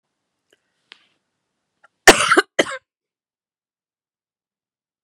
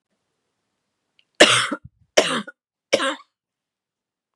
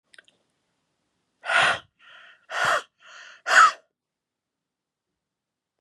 {"cough_length": "5.0 s", "cough_amplitude": 32768, "cough_signal_mean_std_ratio": 0.18, "three_cough_length": "4.4 s", "three_cough_amplitude": 32768, "three_cough_signal_mean_std_ratio": 0.28, "exhalation_length": "5.8 s", "exhalation_amplitude": 21890, "exhalation_signal_mean_std_ratio": 0.29, "survey_phase": "beta (2021-08-13 to 2022-03-07)", "age": "45-64", "gender": "Female", "wearing_mask": "No", "symptom_cough_any": true, "symptom_runny_or_blocked_nose": true, "symptom_sore_throat": true, "symptom_fatigue": true, "symptom_headache": true, "symptom_onset": "2 days", "smoker_status": "Ex-smoker", "respiratory_condition_asthma": true, "respiratory_condition_other": false, "recruitment_source": "Test and Trace", "submission_delay": "1 day", "covid_test_result": "Positive", "covid_test_method": "RT-qPCR", "covid_ct_value": 17.4, "covid_ct_gene": "N gene", "covid_ct_mean": 19.1, "covid_viral_load": "550000 copies/ml", "covid_viral_load_category": "Low viral load (10K-1M copies/ml)"}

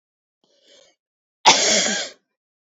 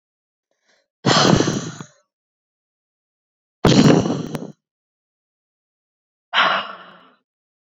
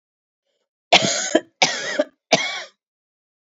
{"cough_length": "2.7 s", "cough_amplitude": 30708, "cough_signal_mean_std_ratio": 0.35, "exhalation_length": "7.7 s", "exhalation_amplitude": 27759, "exhalation_signal_mean_std_ratio": 0.35, "three_cough_length": "3.5 s", "three_cough_amplitude": 30631, "three_cough_signal_mean_std_ratio": 0.37, "survey_phase": "beta (2021-08-13 to 2022-03-07)", "age": "45-64", "gender": "Female", "wearing_mask": "No", "symptom_none": true, "smoker_status": "Current smoker (11 or more cigarettes per day)", "respiratory_condition_asthma": false, "respiratory_condition_other": false, "recruitment_source": "REACT", "submission_delay": "1 day", "covid_test_result": "Negative", "covid_test_method": "RT-qPCR", "influenza_a_test_result": "Negative", "influenza_b_test_result": "Negative"}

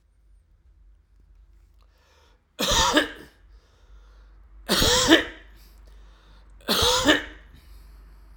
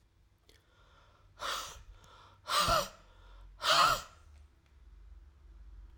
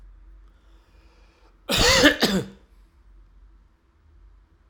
{"three_cough_length": "8.4 s", "three_cough_amplitude": 32767, "three_cough_signal_mean_std_ratio": 0.38, "exhalation_length": "6.0 s", "exhalation_amplitude": 6497, "exhalation_signal_mean_std_ratio": 0.38, "cough_length": "4.7 s", "cough_amplitude": 31702, "cough_signal_mean_std_ratio": 0.33, "survey_phase": "alpha (2021-03-01 to 2021-08-12)", "age": "65+", "gender": "Male", "wearing_mask": "No", "symptom_none": true, "smoker_status": "Never smoked", "respiratory_condition_asthma": false, "respiratory_condition_other": false, "recruitment_source": "REACT", "submission_delay": "1 day", "covid_test_result": "Negative", "covid_test_method": "RT-qPCR"}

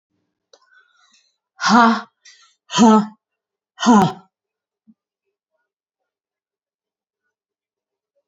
{"exhalation_length": "8.3 s", "exhalation_amplitude": 31067, "exhalation_signal_mean_std_ratio": 0.28, "survey_phase": "beta (2021-08-13 to 2022-03-07)", "age": "45-64", "gender": "Female", "wearing_mask": "No", "symptom_sore_throat": true, "smoker_status": "Never smoked", "respiratory_condition_asthma": false, "respiratory_condition_other": true, "recruitment_source": "Test and Trace", "submission_delay": "2 days", "covid_test_result": "Negative", "covid_test_method": "RT-qPCR"}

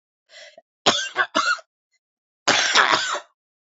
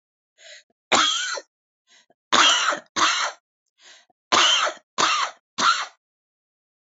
{"cough_length": "3.7 s", "cough_amplitude": 28074, "cough_signal_mean_std_ratio": 0.45, "three_cough_length": "7.0 s", "three_cough_amplitude": 28333, "three_cough_signal_mean_std_ratio": 0.46, "survey_phase": "beta (2021-08-13 to 2022-03-07)", "age": "45-64", "gender": "Female", "wearing_mask": "No", "symptom_cough_any": true, "smoker_status": "Ex-smoker", "respiratory_condition_asthma": true, "respiratory_condition_other": true, "recruitment_source": "REACT", "submission_delay": "1 day", "covid_test_result": "Negative", "covid_test_method": "RT-qPCR"}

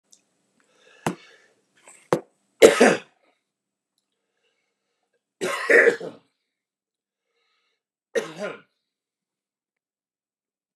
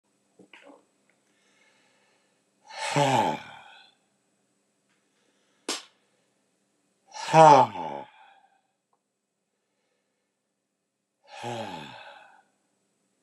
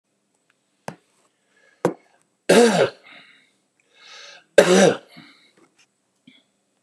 {"three_cough_length": "10.8 s", "three_cough_amplitude": 29204, "three_cough_signal_mean_std_ratio": 0.22, "exhalation_length": "13.2 s", "exhalation_amplitude": 25155, "exhalation_signal_mean_std_ratio": 0.22, "cough_length": "6.8 s", "cough_amplitude": 29204, "cough_signal_mean_std_ratio": 0.28, "survey_phase": "beta (2021-08-13 to 2022-03-07)", "age": "65+", "gender": "Male", "wearing_mask": "No", "symptom_fatigue": true, "symptom_change_to_sense_of_smell_or_taste": true, "smoker_status": "Ex-smoker", "respiratory_condition_asthma": false, "respiratory_condition_other": false, "recruitment_source": "REACT", "submission_delay": "1 day", "covid_test_result": "Negative", "covid_test_method": "RT-qPCR"}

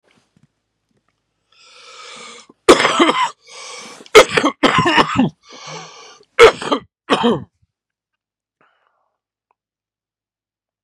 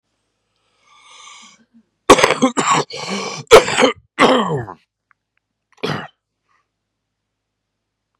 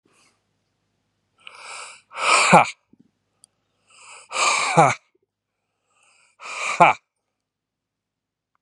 {"three_cough_length": "10.8 s", "three_cough_amplitude": 32768, "three_cough_signal_mean_std_ratio": 0.32, "cough_length": "8.2 s", "cough_amplitude": 32768, "cough_signal_mean_std_ratio": 0.33, "exhalation_length": "8.6 s", "exhalation_amplitude": 32767, "exhalation_signal_mean_std_ratio": 0.29, "survey_phase": "beta (2021-08-13 to 2022-03-07)", "age": "45-64", "gender": "Male", "wearing_mask": "No", "symptom_cough_any": true, "symptom_new_continuous_cough": true, "symptom_runny_or_blocked_nose": true, "symptom_shortness_of_breath": true, "symptom_sore_throat": true, "symptom_abdominal_pain": true, "symptom_fatigue": true, "symptom_fever_high_temperature": true, "symptom_onset": "3 days", "smoker_status": "Never smoked", "respiratory_condition_asthma": true, "respiratory_condition_other": false, "recruitment_source": "Test and Trace", "submission_delay": "1 day", "covid_test_result": "Positive", "covid_test_method": "RT-qPCR", "covid_ct_value": 12.1, "covid_ct_gene": "ORF1ab gene", "covid_ct_mean": 12.8, "covid_viral_load": "64000000 copies/ml", "covid_viral_load_category": "High viral load (>1M copies/ml)"}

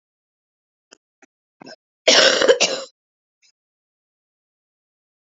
{"cough_length": "5.2 s", "cough_amplitude": 32114, "cough_signal_mean_std_ratio": 0.27, "survey_phase": "alpha (2021-03-01 to 2021-08-12)", "age": "18-44", "gender": "Female", "wearing_mask": "No", "symptom_cough_any": true, "symptom_new_continuous_cough": true, "symptom_shortness_of_breath": true, "symptom_fatigue": true, "symptom_change_to_sense_of_smell_or_taste": true, "symptom_onset": "6 days", "smoker_status": "Ex-smoker", "respiratory_condition_asthma": false, "respiratory_condition_other": false, "recruitment_source": "Test and Trace", "submission_delay": "2 days", "covid_test_result": "Positive", "covid_test_method": "RT-qPCR", "covid_ct_value": 14.7, "covid_ct_gene": "ORF1ab gene", "covid_ct_mean": 15.0, "covid_viral_load": "12000000 copies/ml", "covid_viral_load_category": "High viral load (>1M copies/ml)"}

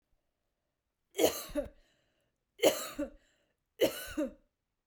{"three_cough_length": "4.9 s", "three_cough_amplitude": 8596, "three_cough_signal_mean_std_ratio": 0.33, "survey_phase": "beta (2021-08-13 to 2022-03-07)", "age": "18-44", "gender": "Female", "wearing_mask": "No", "symptom_none": true, "smoker_status": "Ex-smoker", "respiratory_condition_asthma": false, "respiratory_condition_other": false, "recruitment_source": "REACT", "submission_delay": "0 days", "covid_test_result": "Negative", "covid_test_method": "RT-qPCR"}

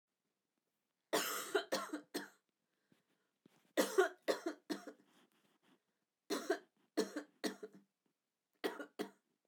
{"three_cough_length": "9.5 s", "three_cough_amplitude": 3794, "three_cough_signal_mean_std_ratio": 0.34, "survey_phase": "beta (2021-08-13 to 2022-03-07)", "age": "45-64", "gender": "Female", "wearing_mask": "No", "symptom_cough_any": true, "symptom_new_continuous_cough": true, "symptom_onset": "12 days", "smoker_status": "Never smoked", "respiratory_condition_asthma": false, "respiratory_condition_other": false, "recruitment_source": "REACT", "submission_delay": "2 days", "covid_test_result": "Negative", "covid_test_method": "RT-qPCR"}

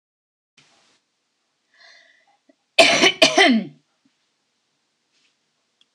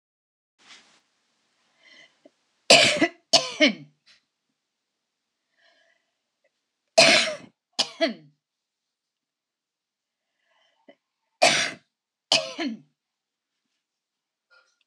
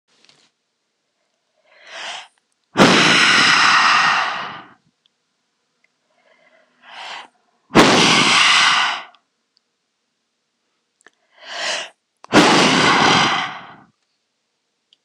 {"cough_length": "5.9 s", "cough_amplitude": 26028, "cough_signal_mean_std_ratio": 0.27, "three_cough_length": "14.9 s", "three_cough_amplitude": 25996, "three_cough_signal_mean_std_ratio": 0.25, "exhalation_length": "15.0 s", "exhalation_amplitude": 26028, "exhalation_signal_mean_std_ratio": 0.46, "survey_phase": "beta (2021-08-13 to 2022-03-07)", "age": "45-64", "gender": "Female", "wearing_mask": "No", "symptom_headache": true, "symptom_loss_of_taste": true, "symptom_onset": "12 days", "smoker_status": "Never smoked", "respiratory_condition_asthma": false, "respiratory_condition_other": false, "recruitment_source": "REACT", "submission_delay": "2 days", "covid_test_result": "Negative", "covid_test_method": "RT-qPCR"}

